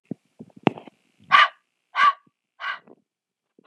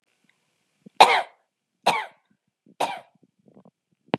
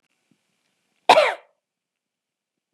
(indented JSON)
{
  "exhalation_length": "3.7 s",
  "exhalation_amplitude": 30783,
  "exhalation_signal_mean_std_ratio": 0.27,
  "three_cough_length": "4.2 s",
  "three_cough_amplitude": 32746,
  "three_cough_signal_mean_std_ratio": 0.23,
  "cough_length": "2.7 s",
  "cough_amplitude": 32710,
  "cough_signal_mean_std_ratio": 0.21,
  "survey_phase": "beta (2021-08-13 to 2022-03-07)",
  "age": "18-44",
  "gender": "Female",
  "wearing_mask": "No",
  "symptom_cough_any": true,
  "smoker_status": "Never smoked",
  "respiratory_condition_asthma": false,
  "respiratory_condition_other": false,
  "recruitment_source": "REACT",
  "submission_delay": "2 days",
  "covid_test_result": "Negative",
  "covid_test_method": "RT-qPCR",
  "influenza_a_test_result": "Negative",
  "influenza_b_test_result": "Negative"
}